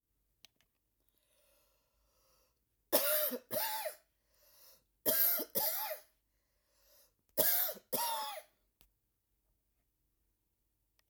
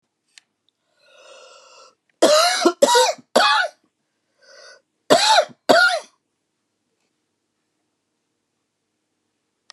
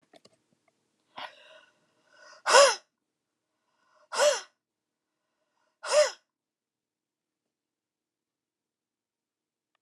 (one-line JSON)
{"three_cough_length": "11.1 s", "three_cough_amplitude": 5858, "three_cough_signal_mean_std_ratio": 0.37, "cough_length": "9.7 s", "cough_amplitude": 32767, "cough_signal_mean_std_ratio": 0.35, "exhalation_length": "9.8 s", "exhalation_amplitude": 21383, "exhalation_signal_mean_std_ratio": 0.21, "survey_phase": "alpha (2021-03-01 to 2021-08-12)", "age": "45-64", "gender": "Female", "wearing_mask": "No", "symptom_cough_any": true, "symptom_headache": true, "smoker_status": "Ex-smoker", "respiratory_condition_asthma": true, "respiratory_condition_other": true, "recruitment_source": "REACT", "submission_delay": "1 day", "covid_test_result": "Negative", "covid_test_method": "RT-qPCR"}